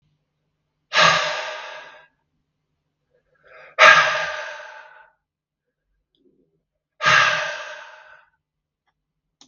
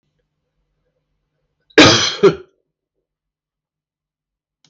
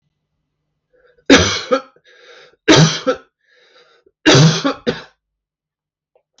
{
  "exhalation_length": "9.5 s",
  "exhalation_amplitude": 32768,
  "exhalation_signal_mean_std_ratio": 0.32,
  "cough_length": "4.7 s",
  "cough_amplitude": 32768,
  "cough_signal_mean_std_ratio": 0.24,
  "three_cough_length": "6.4 s",
  "three_cough_amplitude": 32768,
  "three_cough_signal_mean_std_ratio": 0.36,
  "survey_phase": "beta (2021-08-13 to 2022-03-07)",
  "age": "45-64",
  "gender": "Male",
  "wearing_mask": "No",
  "symptom_none": true,
  "smoker_status": "Ex-smoker",
  "respiratory_condition_asthma": false,
  "respiratory_condition_other": false,
  "recruitment_source": "REACT",
  "submission_delay": "1 day",
  "covid_test_result": "Negative",
  "covid_test_method": "RT-qPCR",
  "influenza_a_test_result": "Negative",
  "influenza_b_test_result": "Negative"
}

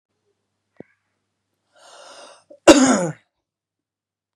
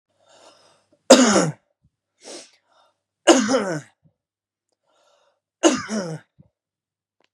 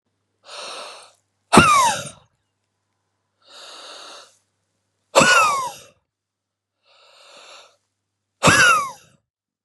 {
  "cough_length": "4.4 s",
  "cough_amplitude": 32768,
  "cough_signal_mean_std_ratio": 0.22,
  "three_cough_length": "7.3 s",
  "three_cough_amplitude": 32768,
  "three_cough_signal_mean_std_ratio": 0.29,
  "exhalation_length": "9.6 s",
  "exhalation_amplitude": 32768,
  "exhalation_signal_mean_std_ratio": 0.33,
  "survey_phase": "beta (2021-08-13 to 2022-03-07)",
  "age": "18-44",
  "gender": "Male",
  "wearing_mask": "No",
  "symptom_none": true,
  "symptom_onset": "12 days",
  "smoker_status": "Ex-smoker",
  "respiratory_condition_asthma": true,
  "respiratory_condition_other": false,
  "recruitment_source": "REACT",
  "submission_delay": "2 days",
  "covid_test_result": "Negative",
  "covid_test_method": "RT-qPCR"
}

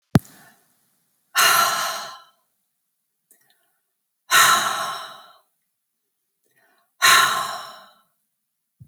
{
  "exhalation_length": "8.9 s",
  "exhalation_amplitude": 30134,
  "exhalation_signal_mean_std_ratio": 0.35,
  "survey_phase": "alpha (2021-03-01 to 2021-08-12)",
  "age": "45-64",
  "gender": "Female",
  "wearing_mask": "No",
  "symptom_none": true,
  "smoker_status": "Never smoked",
  "respiratory_condition_asthma": false,
  "respiratory_condition_other": false,
  "recruitment_source": "REACT",
  "submission_delay": "5 days",
  "covid_test_result": "Negative",
  "covid_test_method": "RT-qPCR"
}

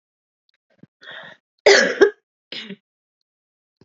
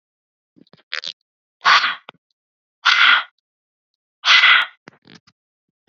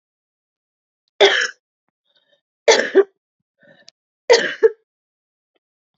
{
  "cough_length": "3.8 s",
  "cough_amplitude": 29368,
  "cough_signal_mean_std_ratio": 0.26,
  "exhalation_length": "5.9 s",
  "exhalation_amplitude": 29247,
  "exhalation_signal_mean_std_ratio": 0.34,
  "three_cough_length": "6.0 s",
  "three_cough_amplitude": 29041,
  "three_cough_signal_mean_std_ratio": 0.28,
  "survey_phase": "beta (2021-08-13 to 2022-03-07)",
  "age": "18-44",
  "gender": "Female",
  "wearing_mask": "No",
  "symptom_cough_any": true,
  "symptom_runny_or_blocked_nose": true,
  "symptom_sore_throat": true,
  "symptom_fatigue": true,
  "symptom_headache": true,
  "symptom_onset": "4 days",
  "smoker_status": "Ex-smoker",
  "respiratory_condition_asthma": false,
  "respiratory_condition_other": false,
  "recruitment_source": "Test and Trace",
  "submission_delay": "1 day",
  "covid_test_result": "Positive",
  "covid_test_method": "RT-qPCR",
  "covid_ct_value": 20.4,
  "covid_ct_gene": "ORF1ab gene"
}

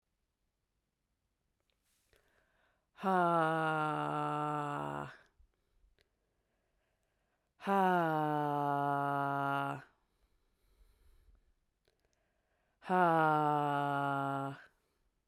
{
  "exhalation_length": "15.3 s",
  "exhalation_amplitude": 4848,
  "exhalation_signal_mean_std_ratio": 0.5,
  "survey_phase": "beta (2021-08-13 to 2022-03-07)",
  "age": "18-44",
  "gender": "Female",
  "wearing_mask": "No",
  "symptom_cough_any": true,
  "symptom_new_continuous_cough": true,
  "symptom_fatigue": true,
  "symptom_fever_high_temperature": true,
  "symptom_change_to_sense_of_smell_or_taste": true,
  "symptom_onset": "5 days",
  "smoker_status": "Never smoked",
  "respiratory_condition_asthma": false,
  "respiratory_condition_other": false,
  "recruitment_source": "Test and Trace",
  "submission_delay": "2 days",
  "covid_test_result": "Positive",
  "covid_test_method": "RT-qPCR"
}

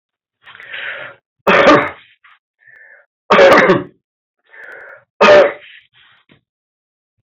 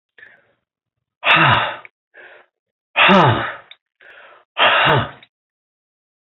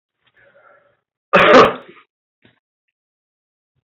{
  "three_cough_length": "7.3 s",
  "three_cough_amplitude": 28385,
  "three_cough_signal_mean_std_ratio": 0.38,
  "exhalation_length": "6.4 s",
  "exhalation_amplitude": 29258,
  "exhalation_signal_mean_std_ratio": 0.4,
  "cough_length": "3.8 s",
  "cough_amplitude": 28315,
  "cough_signal_mean_std_ratio": 0.27,
  "survey_phase": "beta (2021-08-13 to 2022-03-07)",
  "age": "65+",
  "gender": "Male",
  "wearing_mask": "No",
  "symptom_cough_any": true,
  "symptom_runny_or_blocked_nose": true,
  "symptom_change_to_sense_of_smell_or_taste": true,
  "symptom_loss_of_taste": true,
  "smoker_status": "Never smoked",
  "respiratory_condition_asthma": false,
  "respiratory_condition_other": false,
  "recruitment_source": "Test and Trace",
  "submission_delay": "3 days",
  "covid_test_result": "Positive",
  "covid_test_method": "LFT"
}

